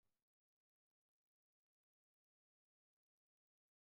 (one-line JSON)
{"cough_length": "3.8 s", "cough_amplitude": 5, "cough_signal_mean_std_ratio": 0.18, "survey_phase": "beta (2021-08-13 to 2022-03-07)", "age": "65+", "gender": "Female", "wearing_mask": "No", "symptom_none": true, "smoker_status": "Ex-smoker", "respiratory_condition_asthma": false, "respiratory_condition_other": false, "recruitment_source": "REACT", "submission_delay": "2 days", "covid_test_result": "Negative", "covid_test_method": "RT-qPCR", "influenza_a_test_result": "Negative", "influenza_b_test_result": "Negative"}